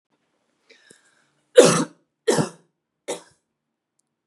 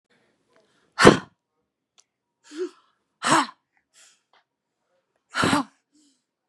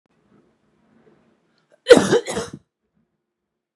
{
  "three_cough_length": "4.3 s",
  "three_cough_amplitude": 32768,
  "three_cough_signal_mean_std_ratio": 0.24,
  "exhalation_length": "6.5 s",
  "exhalation_amplitude": 32768,
  "exhalation_signal_mean_std_ratio": 0.23,
  "cough_length": "3.8 s",
  "cough_amplitude": 32768,
  "cough_signal_mean_std_ratio": 0.22,
  "survey_phase": "beta (2021-08-13 to 2022-03-07)",
  "age": "18-44",
  "gender": "Female",
  "wearing_mask": "No",
  "symptom_none": true,
  "smoker_status": "Never smoked",
  "respiratory_condition_asthma": false,
  "respiratory_condition_other": false,
  "recruitment_source": "REACT",
  "submission_delay": "0 days",
  "covid_test_result": "Negative",
  "covid_test_method": "RT-qPCR",
  "influenza_a_test_result": "Negative",
  "influenza_b_test_result": "Negative"
}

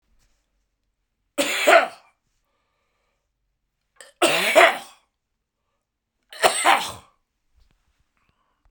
{
  "three_cough_length": "8.7 s",
  "three_cough_amplitude": 32767,
  "three_cough_signal_mean_std_ratio": 0.29,
  "survey_phase": "beta (2021-08-13 to 2022-03-07)",
  "age": "65+",
  "gender": "Male",
  "wearing_mask": "No",
  "symptom_cough_any": true,
  "symptom_runny_or_blocked_nose": true,
  "symptom_onset": "3 days",
  "smoker_status": "Ex-smoker",
  "respiratory_condition_asthma": false,
  "respiratory_condition_other": false,
  "recruitment_source": "Test and Trace",
  "submission_delay": "1 day",
  "covid_test_result": "Positive",
  "covid_test_method": "RT-qPCR",
  "covid_ct_value": 25.2,
  "covid_ct_gene": "ORF1ab gene"
}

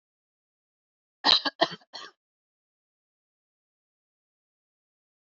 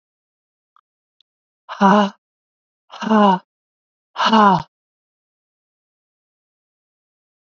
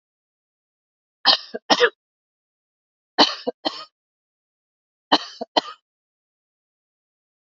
{
  "cough_length": "5.3 s",
  "cough_amplitude": 18412,
  "cough_signal_mean_std_ratio": 0.17,
  "exhalation_length": "7.6 s",
  "exhalation_amplitude": 30620,
  "exhalation_signal_mean_std_ratio": 0.29,
  "three_cough_length": "7.6 s",
  "three_cough_amplitude": 28671,
  "three_cough_signal_mean_std_ratio": 0.22,
  "survey_phase": "beta (2021-08-13 to 2022-03-07)",
  "age": "45-64",
  "gender": "Female",
  "wearing_mask": "No",
  "symptom_cough_any": true,
  "symptom_runny_or_blocked_nose": true,
  "symptom_shortness_of_breath": true,
  "symptom_sore_throat": true,
  "symptom_fatigue": true,
  "symptom_headache": true,
  "smoker_status": "Ex-smoker",
  "respiratory_condition_asthma": false,
  "respiratory_condition_other": false,
  "recruitment_source": "Test and Trace",
  "submission_delay": "2 days",
  "covid_test_result": "Positive",
  "covid_test_method": "RT-qPCR",
  "covid_ct_value": 16.7,
  "covid_ct_gene": "ORF1ab gene",
  "covid_ct_mean": 16.9,
  "covid_viral_load": "3000000 copies/ml",
  "covid_viral_load_category": "High viral load (>1M copies/ml)"
}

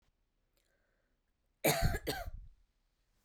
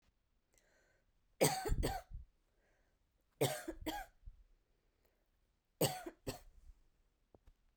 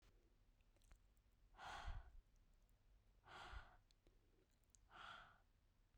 {
  "cough_length": "3.2 s",
  "cough_amplitude": 5411,
  "cough_signal_mean_std_ratio": 0.33,
  "three_cough_length": "7.8 s",
  "three_cough_amplitude": 4236,
  "three_cough_signal_mean_std_ratio": 0.33,
  "exhalation_length": "6.0 s",
  "exhalation_amplitude": 281,
  "exhalation_signal_mean_std_ratio": 0.53,
  "survey_phase": "beta (2021-08-13 to 2022-03-07)",
  "age": "18-44",
  "gender": "Female",
  "wearing_mask": "No",
  "symptom_none": true,
  "smoker_status": "Never smoked",
  "respiratory_condition_asthma": false,
  "respiratory_condition_other": false,
  "recruitment_source": "REACT",
  "submission_delay": "2 days",
  "covid_test_result": "Negative",
  "covid_test_method": "RT-qPCR",
  "influenza_a_test_result": "Negative",
  "influenza_b_test_result": "Negative"
}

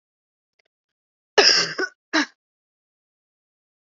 {
  "cough_length": "3.9 s",
  "cough_amplitude": 32158,
  "cough_signal_mean_std_ratio": 0.27,
  "survey_phase": "beta (2021-08-13 to 2022-03-07)",
  "age": "45-64",
  "gender": "Female",
  "wearing_mask": "No",
  "symptom_new_continuous_cough": true,
  "symptom_runny_or_blocked_nose": true,
  "symptom_shortness_of_breath": true,
  "symptom_sore_throat": true,
  "symptom_abdominal_pain": true,
  "symptom_fatigue": true,
  "symptom_fever_high_temperature": true,
  "symptom_headache": true,
  "symptom_onset": "2 days",
  "smoker_status": "Never smoked",
  "respiratory_condition_asthma": false,
  "respiratory_condition_other": false,
  "recruitment_source": "Test and Trace",
  "submission_delay": "2 days",
  "covid_test_result": "Positive",
  "covid_test_method": "RT-qPCR",
  "covid_ct_value": 27.8,
  "covid_ct_gene": "ORF1ab gene",
  "covid_ct_mean": 28.0,
  "covid_viral_load": "630 copies/ml",
  "covid_viral_load_category": "Minimal viral load (< 10K copies/ml)"
}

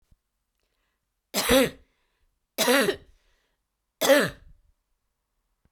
{
  "three_cough_length": "5.7 s",
  "three_cough_amplitude": 17438,
  "three_cough_signal_mean_std_ratio": 0.32,
  "survey_phase": "beta (2021-08-13 to 2022-03-07)",
  "age": "18-44",
  "gender": "Female",
  "wearing_mask": "No",
  "symptom_cough_any": true,
  "symptom_runny_or_blocked_nose": true,
  "symptom_fatigue": true,
  "symptom_fever_high_temperature": true,
  "symptom_headache": true,
  "symptom_change_to_sense_of_smell_or_taste": true,
  "symptom_loss_of_taste": true,
  "symptom_onset": "2 days",
  "smoker_status": "Never smoked",
  "respiratory_condition_asthma": true,
  "respiratory_condition_other": false,
  "recruitment_source": "Test and Trace",
  "submission_delay": "1 day",
  "covid_test_result": "Positive",
  "covid_test_method": "RT-qPCR",
  "covid_ct_value": 18.5,
  "covid_ct_gene": "ORF1ab gene"
}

